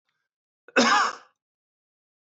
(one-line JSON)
{"cough_length": "2.4 s", "cough_amplitude": 14493, "cough_signal_mean_std_ratio": 0.31, "survey_phase": "beta (2021-08-13 to 2022-03-07)", "age": "45-64", "gender": "Male", "wearing_mask": "No", "symptom_headache": true, "symptom_onset": "5 days", "smoker_status": "Never smoked", "respiratory_condition_asthma": true, "respiratory_condition_other": false, "recruitment_source": "Test and Trace", "submission_delay": "2 days", "covid_test_result": "Positive", "covid_test_method": "RT-qPCR", "covid_ct_value": 27.9, "covid_ct_gene": "N gene"}